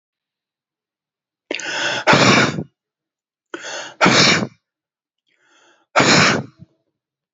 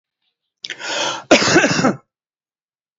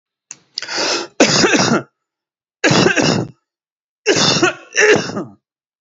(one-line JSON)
{"exhalation_length": "7.3 s", "exhalation_amplitude": 32305, "exhalation_signal_mean_std_ratio": 0.41, "cough_length": "3.0 s", "cough_amplitude": 29226, "cough_signal_mean_std_ratio": 0.43, "three_cough_length": "5.8 s", "three_cough_amplitude": 31206, "three_cough_signal_mean_std_ratio": 0.55, "survey_phase": "alpha (2021-03-01 to 2021-08-12)", "age": "18-44", "gender": "Male", "wearing_mask": "No", "symptom_none": true, "smoker_status": "Never smoked", "respiratory_condition_asthma": false, "respiratory_condition_other": false, "recruitment_source": "REACT", "submission_delay": "1 day", "covid_test_result": "Negative", "covid_test_method": "RT-qPCR"}